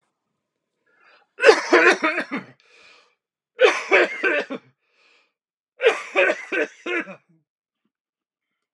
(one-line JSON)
{"three_cough_length": "8.7 s", "three_cough_amplitude": 32589, "three_cough_signal_mean_std_ratio": 0.37, "survey_phase": "beta (2021-08-13 to 2022-03-07)", "age": "65+", "gender": "Male", "wearing_mask": "No", "symptom_none": true, "smoker_status": "Never smoked", "respiratory_condition_asthma": false, "respiratory_condition_other": false, "recruitment_source": "REACT", "submission_delay": "1 day", "covid_test_result": "Negative", "covid_test_method": "RT-qPCR", "influenza_a_test_result": "Negative", "influenza_b_test_result": "Negative"}